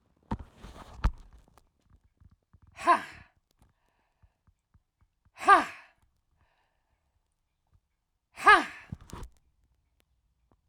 {"exhalation_length": "10.7 s", "exhalation_amplitude": 14301, "exhalation_signal_mean_std_ratio": 0.21, "survey_phase": "alpha (2021-03-01 to 2021-08-12)", "age": "45-64", "gender": "Female", "wearing_mask": "No", "symptom_cough_any": true, "symptom_fatigue": true, "smoker_status": "Current smoker (11 or more cigarettes per day)", "respiratory_condition_asthma": true, "respiratory_condition_other": true, "recruitment_source": "REACT", "submission_delay": "2 days", "covid_test_result": "Negative", "covid_test_method": "RT-qPCR"}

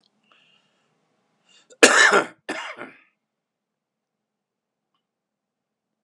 {"cough_length": "6.0 s", "cough_amplitude": 32768, "cough_signal_mean_std_ratio": 0.22, "survey_phase": "beta (2021-08-13 to 2022-03-07)", "age": "65+", "gender": "Male", "wearing_mask": "No", "symptom_cough_any": true, "symptom_runny_or_blocked_nose": true, "symptom_fatigue": true, "symptom_headache": true, "symptom_onset": "3 days", "smoker_status": "Ex-smoker", "respiratory_condition_asthma": false, "respiratory_condition_other": false, "recruitment_source": "Test and Trace", "submission_delay": "2 days", "covid_test_result": "Positive", "covid_test_method": "RT-qPCR", "covid_ct_value": 12.1, "covid_ct_gene": "ORF1ab gene", "covid_ct_mean": 12.6, "covid_viral_load": "75000000 copies/ml", "covid_viral_load_category": "High viral load (>1M copies/ml)"}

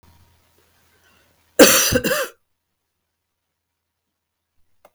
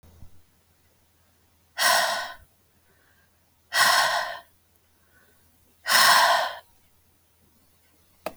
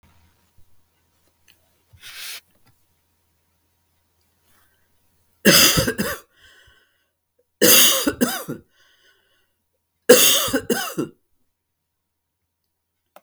{"cough_length": "4.9 s", "cough_amplitude": 32768, "cough_signal_mean_std_ratio": 0.25, "exhalation_length": "8.4 s", "exhalation_amplitude": 18760, "exhalation_signal_mean_std_ratio": 0.37, "three_cough_length": "13.2 s", "three_cough_amplitude": 32768, "three_cough_signal_mean_std_ratio": 0.29, "survey_phase": "beta (2021-08-13 to 2022-03-07)", "age": "45-64", "gender": "Female", "wearing_mask": "No", "symptom_none": true, "smoker_status": "Never smoked", "respiratory_condition_asthma": false, "respiratory_condition_other": false, "recruitment_source": "REACT", "submission_delay": "2 days", "covid_test_result": "Negative", "covid_test_method": "RT-qPCR", "influenza_a_test_result": "Negative", "influenza_b_test_result": "Negative"}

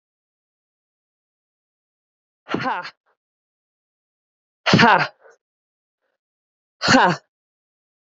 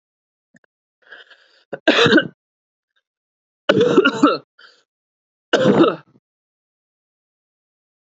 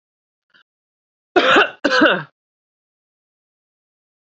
{"exhalation_length": "8.2 s", "exhalation_amplitude": 28577, "exhalation_signal_mean_std_ratio": 0.25, "three_cough_length": "8.1 s", "three_cough_amplitude": 30635, "three_cough_signal_mean_std_ratio": 0.33, "cough_length": "4.3 s", "cough_amplitude": 29573, "cough_signal_mean_std_ratio": 0.31, "survey_phase": "alpha (2021-03-01 to 2021-08-12)", "age": "18-44", "gender": "Female", "wearing_mask": "No", "symptom_none": true, "smoker_status": "Current smoker (e-cigarettes or vapes only)", "respiratory_condition_asthma": false, "respiratory_condition_other": false, "recruitment_source": "REACT", "submission_delay": "2 days", "covid_test_result": "Negative", "covid_test_method": "RT-qPCR"}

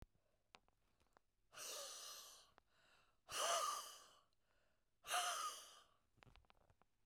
{"exhalation_length": "7.1 s", "exhalation_amplitude": 1331, "exhalation_signal_mean_std_ratio": 0.42, "survey_phase": "beta (2021-08-13 to 2022-03-07)", "age": "65+", "gender": "Female", "wearing_mask": "No", "symptom_none": true, "smoker_status": "Ex-smoker", "respiratory_condition_asthma": true, "respiratory_condition_other": false, "recruitment_source": "REACT", "submission_delay": "1 day", "covid_test_result": "Negative", "covid_test_method": "RT-qPCR", "influenza_a_test_result": "Negative", "influenza_b_test_result": "Negative"}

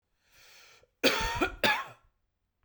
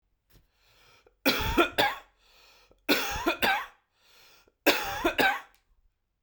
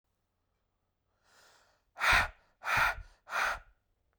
{"cough_length": "2.6 s", "cough_amplitude": 10329, "cough_signal_mean_std_ratio": 0.4, "three_cough_length": "6.2 s", "three_cough_amplitude": 14811, "three_cough_signal_mean_std_ratio": 0.43, "exhalation_length": "4.2 s", "exhalation_amplitude": 6997, "exhalation_signal_mean_std_ratio": 0.37, "survey_phase": "beta (2021-08-13 to 2022-03-07)", "age": "18-44", "gender": "Male", "wearing_mask": "No", "symptom_runny_or_blocked_nose": true, "symptom_fatigue": true, "symptom_change_to_sense_of_smell_or_taste": true, "symptom_onset": "2 days", "smoker_status": "Never smoked", "respiratory_condition_asthma": false, "respiratory_condition_other": false, "recruitment_source": "Test and Trace", "submission_delay": "1 day", "covid_test_result": "Positive", "covid_test_method": "RT-qPCR", "covid_ct_value": 29.6, "covid_ct_gene": "ORF1ab gene", "covid_ct_mean": 30.3, "covid_viral_load": "120 copies/ml", "covid_viral_load_category": "Minimal viral load (< 10K copies/ml)"}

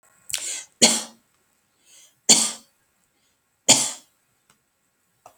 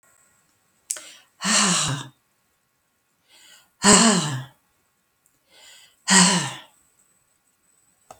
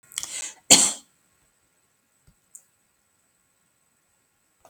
{"three_cough_length": "5.4 s", "three_cough_amplitude": 32768, "three_cough_signal_mean_std_ratio": 0.27, "exhalation_length": "8.2 s", "exhalation_amplitude": 32768, "exhalation_signal_mean_std_ratio": 0.34, "cough_length": "4.7 s", "cough_amplitude": 32768, "cough_signal_mean_std_ratio": 0.19, "survey_phase": "beta (2021-08-13 to 2022-03-07)", "age": "65+", "gender": "Female", "wearing_mask": "No", "symptom_none": true, "smoker_status": "Never smoked", "respiratory_condition_asthma": false, "respiratory_condition_other": false, "recruitment_source": "REACT", "submission_delay": "3 days", "covid_test_result": "Negative", "covid_test_method": "RT-qPCR"}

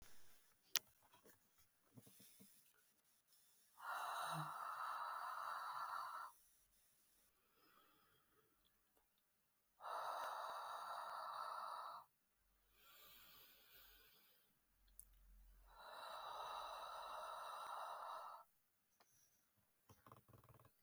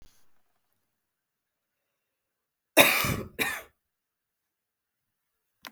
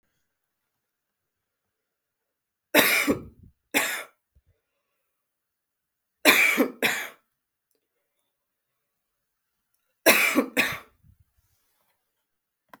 {"exhalation_length": "20.8 s", "exhalation_amplitude": 9180, "exhalation_signal_mean_std_ratio": 0.58, "cough_length": "5.7 s", "cough_amplitude": 28266, "cough_signal_mean_std_ratio": 0.22, "three_cough_length": "12.8 s", "three_cough_amplitude": 27413, "three_cough_signal_mean_std_ratio": 0.29, "survey_phase": "beta (2021-08-13 to 2022-03-07)", "age": "18-44", "gender": "Female", "wearing_mask": "No", "symptom_cough_any": true, "symptom_runny_or_blocked_nose": true, "symptom_sore_throat": true, "symptom_fatigue": true, "smoker_status": "Never smoked", "respiratory_condition_asthma": false, "respiratory_condition_other": false, "recruitment_source": "Test and Trace", "submission_delay": "2 days", "covid_test_result": "Positive", "covid_test_method": "RT-qPCR", "covid_ct_value": 24.2, "covid_ct_gene": "ORF1ab gene", "covid_ct_mean": 25.0, "covid_viral_load": "6200 copies/ml", "covid_viral_load_category": "Minimal viral load (< 10K copies/ml)"}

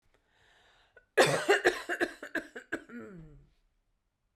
{"cough_length": "4.4 s", "cough_amplitude": 10988, "cough_signal_mean_std_ratio": 0.35, "survey_phase": "beta (2021-08-13 to 2022-03-07)", "age": "18-44", "gender": "Female", "wearing_mask": "No", "symptom_none": true, "smoker_status": "Never smoked", "respiratory_condition_asthma": false, "respiratory_condition_other": false, "recruitment_source": "REACT", "submission_delay": "1 day", "covid_test_result": "Negative", "covid_test_method": "RT-qPCR"}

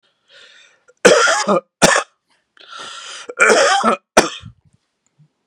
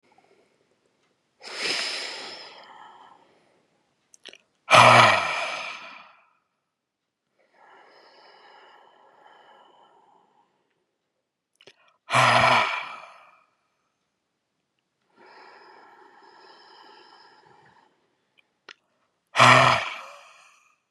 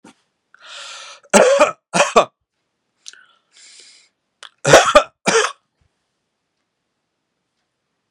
{"cough_length": "5.5 s", "cough_amplitude": 32768, "cough_signal_mean_std_ratio": 0.43, "exhalation_length": "20.9 s", "exhalation_amplitude": 31230, "exhalation_signal_mean_std_ratio": 0.27, "three_cough_length": "8.1 s", "three_cough_amplitude": 32768, "three_cough_signal_mean_std_ratio": 0.3, "survey_phase": "beta (2021-08-13 to 2022-03-07)", "age": "45-64", "gender": "Male", "wearing_mask": "No", "symptom_none": true, "smoker_status": "Ex-smoker", "respiratory_condition_asthma": false, "respiratory_condition_other": false, "recruitment_source": "REACT", "submission_delay": "2 days", "covid_test_result": "Negative", "covid_test_method": "RT-qPCR", "influenza_a_test_result": "Negative", "influenza_b_test_result": "Negative"}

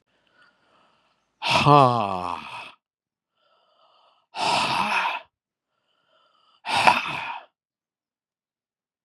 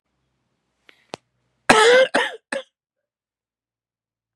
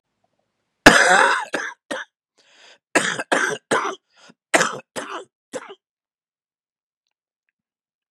{"exhalation_length": "9.0 s", "exhalation_amplitude": 32767, "exhalation_signal_mean_std_ratio": 0.35, "cough_length": "4.4 s", "cough_amplitude": 32768, "cough_signal_mean_std_ratio": 0.29, "three_cough_length": "8.1 s", "three_cough_amplitude": 32768, "three_cough_signal_mean_std_ratio": 0.32, "survey_phase": "beta (2021-08-13 to 2022-03-07)", "age": "45-64", "gender": "Male", "wearing_mask": "No", "symptom_cough_any": true, "symptom_new_continuous_cough": true, "symptom_runny_or_blocked_nose": true, "symptom_sore_throat": true, "symptom_abdominal_pain": true, "symptom_fatigue": true, "symptom_fever_high_temperature": true, "symptom_onset": "2 days", "smoker_status": "Never smoked", "respiratory_condition_asthma": false, "respiratory_condition_other": false, "recruitment_source": "Test and Trace", "submission_delay": "1 day", "covid_test_result": "Positive", "covid_test_method": "LAMP"}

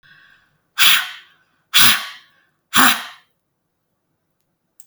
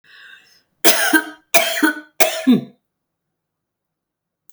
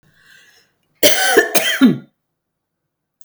{"exhalation_length": "4.9 s", "exhalation_amplitude": 32768, "exhalation_signal_mean_std_ratio": 0.32, "three_cough_length": "4.5 s", "three_cough_amplitude": 32768, "three_cough_signal_mean_std_ratio": 0.38, "cough_length": "3.2 s", "cough_amplitude": 32768, "cough_signal_mean_std_ratio": 0.4, "survey_phase": "beta (2021-08-13 to 2022-03-07)", "age": "65+", "gender": "Female", "wearing_mask": "No", "symptom_none": true, "smoker_status": "Never smoked", "respiratory_condition_asthma": false, "respiratory_condition_other": false, "recruitment_source": "REACT", "submission_delay": "2 days", "covid_test_result": "Negative", "covid_test_method": "RT-qPCR", "influenza_a_test_result": "Negative", "influenza_b_test_result": "Negative"}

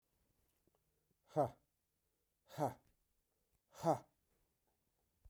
{"exhalation_length": "5.3 s", "exhalation_amplitude": 2635, "exhalation_signal_mean_std_ratio": 0.22, "survey_phase": "beta (2021-08-13 to 2022-03-07)", "age": "65+", "gender": "Male", "wearing_mask": "No", "symptom_cough_any": true, "symptom_runny_or_blocked_nose": true, "symptom_sore_throat": true, "smoker_status": "Ex-smoker", "respiratory_condition_asthma": false, "respiratory_condition_other": false, "recruitment_source": "REACT", "submission_delay": "1 day", "covid_test_result": "Negative", "covid_test_method": "RT-qPCR"}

